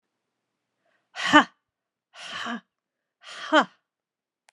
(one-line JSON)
{"exhalation_length": "4.5 s", "exhalation_amplitude": 31281, "exhalation_signal_mean_std_ratio": 0.23, "survey_phase": "beta (2021-08-13 to 2022-03-07)", "age": "18-44", "gender": "Female", "wearing_mask": "No", "symptom_cough_any": true, "symptom_runny_or_blocked_nose": true, "symptom_shortness_of_breath": true, "symptom_sore_throat": true, "symptom_fatigue": true, "symptom_fever_high_temperature": true, "symptom_headache": true, "symptom_change_to_sense_of_smell_or_taste": true, "symptom_onset": "5 days", "smoker_status": "Never smoked", "respiratory_condition_asthma": false, "respiratory_condition_other": false, "recruitment_source": "Test and Trace", "submission_delay": "3 days", "covid_test_result": "Positive", "covid_test_method": "RT-qPCR", "covid_ct_value": 26.0, "covid_ct_gene": "ORF1ab gene", "covid_ct_mean": 26.8, "covid_viral_load": "1700 copies/ml", "covid_viral_load_category": "Minimal viral load (< 10K copies/ml)"}